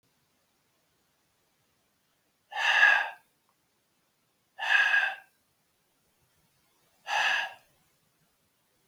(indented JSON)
{
  "exhalation_length": "8.9 s",
  "exhalation_amplitude": 12767,
  "exhalation_signal_mean_std_ratio": 0.32,
  "survey_phase": "beta (2021-08-13 to 2022-03-07)",
  "age": "65+",
  "gender": "Male",
  "wearing_mask": "No",
  "symptom_none": true,
  "smoker_status": "Ex-smoker",
  "respiratory_condition_asthma": false,
  "respiratory_condition_other": false,
  "recruitment_source": "REACT",
  "submission_delay": "2 days",
  "covid_test_result": "Negative",
  "covid_test_method": "RT-qPCR",
  "influenza_a_test_result": "Negative",
  "influenza_b_test_result": "Negative"
}